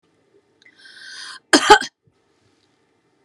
{"cough_length": "3.2 s", "cough_amplitude": 32768, "cough_signal_mean_std_ratio": 0.22, "survey_phase": "beta (2021-08-13 to 2022-03-07)", "age": "65+", "gender": "Female", "wearing_mask": "No", "symptom_none": true, "smoker_status": "Ex-smoker", "respiratory_condition_asthma": true, "respiratory_condition_other": false, "recruitment_source": "REACT", "submission_delay": "2 days", "covid_test_result": "Negative", "covid_test_method": "RT-qPCR"}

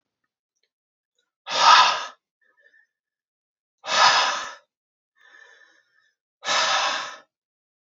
{"exhalation_length": "7.9 s", "exhalation_amplitude": 27049, "exhalation_signal_mean_std_ratio": 0.35, "survey_phase": "beta (2021-08-13 to 2022-03-07)", "age": "18-44", "gender": "Male", "wearing_mask": "No", "symptom_cough_any": true, "smoker_status": "Ex-smoker", "respiratory_condition_asthma": false, "respiratory_condition_other": false, "recruitment_source": "Test and Trace", "submission_delay": "2 days", "covid_test_result": "Positive", "covid_test_method": "LFT"}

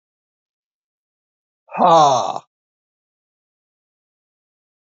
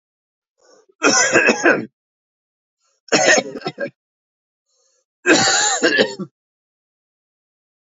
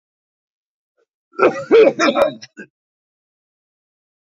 {"exhalation_length": "4.9 s", "exhalation_amplitude": 30209, "exhalation_signal_mean_std_ratio": 0.26, "three_cough_length": "7.9 s", "three_cough_amplitude": 28583, "three_cough_signal_mean_std_ratio": 0.42, "cough_length": "4.3 s", "cough_amplitude": 27992, "cough_signal_mean_std_ratio": 0.32, "survey_phase": "beta (2021-08-13 to 2022-03-07)", "age": "45-64", "gender": "Male", "wearing_mask": "No", "symptom_runny_or_blocked_nose": true, "symptom_change_to_sense_of_smell_or_taste": true, "smoker_status": "Ex-smoker", "respiratory_condition_asthma": false, "respiratory_condition_other": true, "recruitment_source": "Test and Trace", "submission_delay": "2 days", "covid_test_result": "Positive", "covid_test_method": "RT-qPCR"}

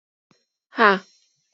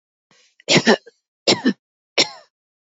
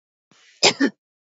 {"exhalation_length": "1.5 s", "exhalation_amplitude": 26565, "exhalation_signal_mean_std_ratio": 0.25, "three_cough_length": "3.0 s", "three_cough_amplitude": 32513, "three_cough_signal_mean_std_ratio": 0.32, "cough_length": "1.4 s", "cough_amplitude": 28200, "cough_signal_mean_std_ratio": 0.29, "survey_phase": "beta (2021-08-13 to 2022-03-07)", "age": "18-44", "gender": "Female", "wearing_mask": "No", "symptom_none": true, "smoker_status": "Never smoked", "respiratory_condition_asthma": false, "respiratory_condition_other": false, "recruitment_source": "REACT", "submission_delay": "2 days", "covid_test_result": "Negative", "covid_test_method": "RT-qPCR", "influenza_a_test_result": "Negative", "influenza_b_test_result": "Negative"}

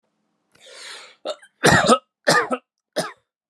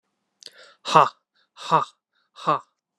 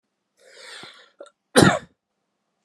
{"three_cough_length": "3.5 s", "three_cough_amplitude": 30911, "three_cough_signal_mean_std_ratio": 0.37, "exhalation_length": "3.0 s", "exhalation_amplitude": 30607, "exhalation_signal_mean_std_ratio": 0.28, "cough_length": "2.6 s", "cough_amplitude": 32222, "cough_signal_mean_std_ratio": 0.23, "survey_phase": "beta (2021-08-13 to 2022-03-07)", "age": "18-44", "gender": "Male", "wearing_mask": "No", "symptom_cough_any": true, "symptom_runny_or_blocked_nose": true, "symptom_sore_throat": true, "symptom_fatigue": true, "symptom_headache": true, "symptom_change_to_sense_of_smell_or_taste": true, "symptom_onset": "9 days", "smoker_status": "Never smoked", "respiratory_condition_asthma": false, "respiratory_condition_other": false, "recruitment_source": "Test and Trace", "submission_delay": "2 days", "covid_test_result": "Positive", "covid_test_method": "RT-qPCR", "covid_ct_value": 14.0, "covid_ct_gene": "ORF1ab gene", "covid_ct_mean": 14.3, "covid_viral_load": "21000000 copies/ml", "covid_viral_load_category": "High viral load (>1M copies/ml)"}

